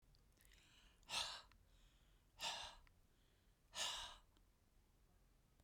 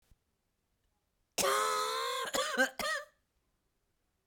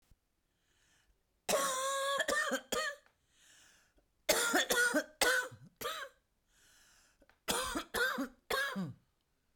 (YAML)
exhalation_length: 5.6 s
exhalation_amplitude: 953
exhalation_signal_mean_std_ratio: 0.43
cough_length: 4.3 s
cough_amplitude: 6191
cough_signal_mean_std_ratio: 0.5
three_cough_length: 9.6 s
three_cough_amplitude: 6517
three_cough_signal_mean_std_ratio: 0.52
survey_phase: beta (2021-08-13 to 2022-03-07)
age: 65+
gender: Female
wearing_mask: 'No'
symptom_cough_any: true
symptom_new_continuous_cough: true
symptom_fatigue: true
symptom_headache: true
symptom_onset: 8 days
smoker_status: Ex-smoker
respiratory_condition_asthma: false
respiratory_condition_other: false
recruitment_source: REACT
submission_delay: 1 day
covid_test_result: Negative
covid_test_method: RT-qPCR
influenza_a_test_result: Negative
influenza_b_test_result: Negative